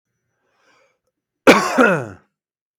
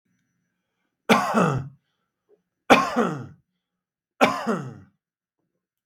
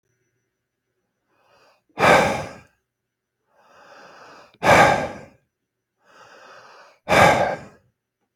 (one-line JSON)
{"cough_length": "2.8 s", "cough_amplitude": 32768, "cough_signal_mean_std_ratio": 0.32, "three_cough_length": "5.9 s", "three_cough_amplitude": 32768, "three_cough_signal_mean_std_ratio": 0.35, "exhalation_length": "8.4 s", "exhalation_amplitude": 29479, "exhalation_signal_mean_std_ratio": 0.32, "survey_phase": "beta (2021-08-13 to 2022-03-07)", "age": "45-64", "gender": "Male", "wearing_mask": "No", "symptom_none": true, "smoker_status": "Ex-smoker", "respiratory_condition_asthma": false, "respiratory_condition_other": false, "recruitment_source": "REACT", "submission_delay": "1 day", "covid_test_result": "Negative", "covid_test_method": "RT-qPCR", "influenza_a_test_result": "Negative", "influenza_b_test_result": "Negative"}